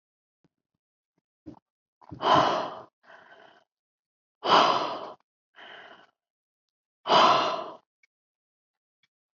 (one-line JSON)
{"exhalation_length": "9.4 s", "exhalation_amplitude": 16597, "exhalation_signal_mean_std_ratio": 0.32, "survey_phase": "beta (2021-08-13 to 2022-03-07)", "age": "45-64", "gender": "Female", "wearing_mask": "No", "symptom_new_continuous_cough": true, "symptom_runny_or_blocked_nose": true, "smoker_status": "Never smoked", "respiratory_condition_asthma": false, "respiratory_condition_other": false, "recruitment_source": "Test and Trace", "submission_delay": "1 day", "covid_test_result": "Positive", "covid_test_method": "ePCR"}